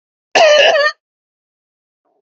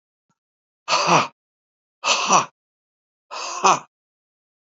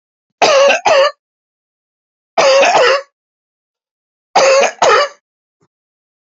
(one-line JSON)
{"cough_length": "2.2 s", "cough_amplitude": 29026, "cough_signal_mean_std_ratio": 0.45, "exhalation_length": "4.7 s", "exhalation_amplitude": 30518, "exhalation_signal_mean_std_ratio": 0.36, "three_cough_length": "6.4 s", "three_cough_amplitude": 30122, "three_cough_signal_mean_std_ratio": 0.48, "survey_phase": "beta (2021-08-13 to 2022-03-07)", "age": "65+", "gender": "Male", "wearing_mask": "No", "symptom_none": true, "smoker_status": "Never smoked", "respiratory_condition_asthma": false, "respiratory_condition_other": false, "recruitment_source": "REACT", "submission_delay": "2 days", "covid_test_result": "Negative", "covid_test_method": "RT-qPCR", "influenza_a_test_result": "Negative", "influenza_b_test_result": "Negative"}